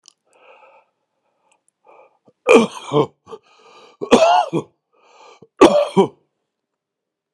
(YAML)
three_cough_length: 7.3 s
three_cough_amplitude: 32768
three_cough_signal_mean_std_ratio: 0.31
survey_phase: beta (2021-08-13 to 2022-03-07)
age: 45-64
gender: Male
wearing_mask: 'No'
symptom_cough_any: true
symptom_runny_or_blocked_nose: true
symptom_fatigue: true
symptom_fever_high_temperature: true
symptom_onset: 2 days
smoker_status: Current smoker (11 or more cigarettes per day)
respiratory_condition_asthma: false
respiratory_condition_other: false
recruitment_source: Test and Trace
submission_delay: 2 days
covid_test_result: Positive
covid_test_method: RT-qPCR
covid_ct_value: 27.2
covid_ct_gene: N gene